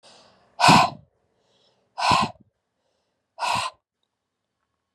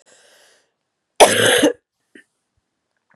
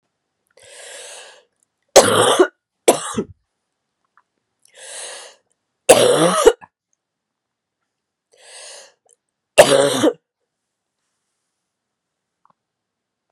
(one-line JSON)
{"exhalation_length": "4.9 s", "exhalation_amplitude": 28648, "exhalation_signal_mean_std_ratio": 0.31, "cough_length": "3.2 s", "cough_amplitude": 32768, "cough_signal_mean_std_ratio": 0.31, "three_cough_length": "13.3 s", "three_cough_amplitude": 32768, "three_cough_signal_mean_std_ratio": 0.29, "survey_phase": "beta (2021-08-13 to 2022-03-07)", "age": "45-64", "gender": "Female", "wearing_mask": "No", "symptom_cough_any": true, "symptom_runny_or_blocked_nose": true, "symptom_fatigue": true, "symptom_headache": true, "symptom_change_to_sense_of_smell_or_taste": true, "symptom_onset": "5 days", "smoker_status": "Never smoked", "respiratory_condition_asthma": false, "respiratory_condition_other": false, "recruitment_source": "Test and Trace", "submission_delay": "2 days", "covid_test_result": "Positive", "covid_test_method": "RT-qPCR", "covid_ct_value": 16.5, "covid_ct_gene": "ORF1ab gene", "covid_ct_mean": 16.9, "covid_viral_load": "2800000 copies/ml", "covid_viral_load_category": "High viral load (>1M copies/ml)"}